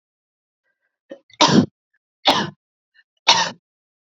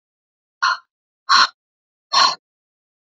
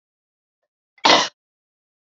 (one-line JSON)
{"three_cough_length": "4.2 s", "three_cough_amplitude": 30269, "three_cough_signal_mean_std_ratio": 0.3, "exhalation_length": "3.2 s", "exhalation_amplitude": 28836, "exhalation_signal_mean_std_ratio": 0.32, "cough_length": "2.1 s", "cough_amplitude": 28623, "cough_signal_mean_std_ratio": 0.24, "survey_phase": "alpha (2021-03-01 to 2021-08-12)", "age": "18-44", "gender": "Female", "wearing_mask": "No", "symptom_fatigue": true, "symptom_headache": true, "symptom_change_to_sense_of_smell_or_taste": true, "symptom_loss_of_taste": true, "smoker_status": "Never smoked", "respiratory_condition_asthma": false, "respiratory_condition_other": false, "recruitment_source": "Test and Trace", "submission_delay": "3 days", "covid_test_result": "Positive", "covid_test_method": "RT-qPCR", "covid_ct_value": 16.6, "covid_ct_gene": "ORF1ab gene", "covid_ct_mean": 17.1, "covid_viral_load": "2400000 copies/ml", "covid_viral_load_category": "High viral load (>1M copies/ml)"}